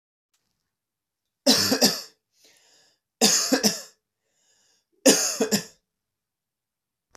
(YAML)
three_cough_length: 7.2 s
three_cough_amplitude: 27154
three_cough_signal_mean_std_ratio: 0.34
survey_phase: alpha (2021-03-01 to 2021-08-12)
age: 18-44
gender: Male
wearing_mask: 'No'
symptom_none: true
smoker_status: Never smoked
respiratory_condition_asthma: false
respiratory_condition_other: false
recruitment_source: REACT
submission_delay: 3 days
covid_test_result: Negative
covid_test_method: RT-qPCR